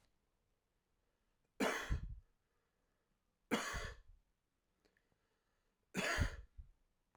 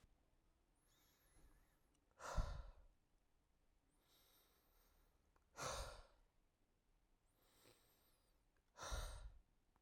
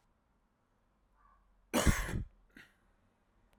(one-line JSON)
{"three_cough_length": "7.2 s", "three_cough_amplitude": 2222, "three_cough_signal_mean_std_ratio": 0.35, "exhalation_length": "9.8 s", "exhalation_amplitude": 882, "exhalation_signal_mean_std_ratio": 0.34, "cough_length": "3.6 s", "cough_amplitude": 5997, "cough_signal_mean_std_ratio": 0.27, "survey_phase": "alpha (2021-03-01 to 2021-08-12)", "age": "18-44", "gender": "Male", "wearing_mask": "No", "symptom_cough_any": true, "symptom_fatigue": true, "symptom_change_to_sense_of_smell_or_taste": true, "symptom_onset": "2 days", "smoker_status": "Never smoked", "respiratory_condition_asthma": true, "respiratory_condition_other": false, "recruitment_source": "Test and Trace", "submission_delay": "1 day", "covid_test_result": "Positive", "covid_test_method": "RT-qPCR", "covid_ct_value": 22.7, "covid_ct_gene": "ORF1ab gene"}